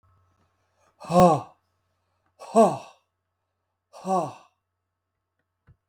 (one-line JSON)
{"exhalation_length": "5.9 s", "exhalation_amplitude": 19911, "exhalation_signal_mean_std_ratio": 0.26, "survey_phase": "beta (2021-08-13 to 2022-03-07)", "age": "45-64", "gender": "Male", "wearing_mask": "No", "symptom_none": true, "smoker_status": "Ex-smoker", "respiratory_condition_asthma": true, "respiratory_condition_other": true, "recruitment_source": "REACT", "submission_delay": "1 day", "covid_test_result": "Negative", "covid_test_method": "RT-qPCR", "influenza_a_test_result": "Unknown/Void", "influenza_b_test_result": "Unknown/Void"}